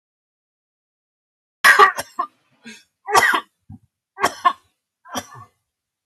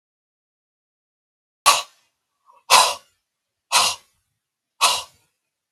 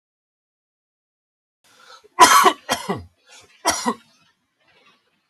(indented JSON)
{
  "three_cough_length": "6.1 s",
  "three_cough_amplitude": 32768,
  "three_cough_signal_mean_std_ratio": 0.29,
  "exhalation_length": "5.7 s",
  "exhalation_amplitude": 32768,
  "exhalation_signal_mean_std_ratio": 0.28,
  "cough_length": "5.3 s",
  "cough_amplitude": 32767,
  "cough_signal_mean_std_ratio": 0.27,
  "survey_phase": "beta (2021-08-13 to 2022-03-07)",
  "age": "65+",
  "gender": "Male",
  "wearing_mask": "No",
  "symptom_none": true,
  "smoker_status": "Ex-smoker",
  "respiratory_condition_asthma": false,
  "respiratory_condition_other": false,
  "recruitment_source": "REACT",
  "submission_delay": "2 days",
  "covid_test_result": "Negative",
  "covid_test_method": "RT-qPCR",
  "influenza_a_test_result": "Negative",
  "influenza_b_test_result": "Negative"
}